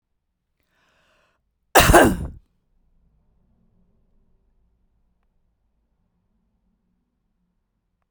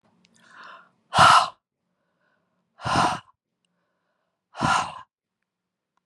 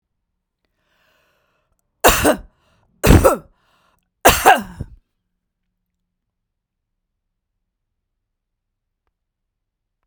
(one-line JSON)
{"cough_length": "8.1 s", "cough_amplitude": 32768, "cough_signal_mean_std_ratio": 0.19, "exhalation_length": "6.1 s", "exhalation_amplitude": 22349, "exhalation_signal_mean_std_ratio": 0.29, "three_cough_length": "10.1 s", "three_cough_amplitude": 32768, "three_cough_signal_mean_std_ratio": 0.23, "survey_phase": "beta (2021-08-13 to 2022-03-07)", "age": "45-64", "gender": "Female", "wearing_mask": "No", "symptom_none": true, "smoker_status": "Ex-smoker", "respiratory_condition_asthma": false, "respiratory_condition_other": false, "recruitment_source": "REACT", "submission_delay": "3 days", "covid_test_result": "Negative", "covid_test_method": "RT-qPCR", "influenza_a_test_result": "Negative", "influenza_b_test_result": "Negative"}